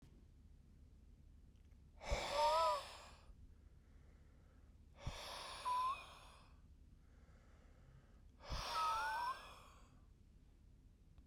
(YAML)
exhalation_length: 11.3 s
exhalation_amplitude: 1687
exhalation_signal_mean_std_ratio: 0.49
survey_phase: alpha (2021-03-01 to 2021-08-12)
age: 18-44
gender: Male
wearing_mask: 'No'
symptom_cough_any: true
symptom_new_continuous_cough: true
symptom_fatigue: true
symptom_fever_high_temperature: true
symptom_headache: true
symptom_onset: 5 days
smoker_status: Never smoked
respiratory_condition_asthma: false
respiratory_condition_other: false
recruitment_source: Test and Trace
submission_delay: 2 days
covid_test_result: Positive
covid_test_method: RT-qPCR
covid_ct_value: 30.5
covid_ct_gene: N gene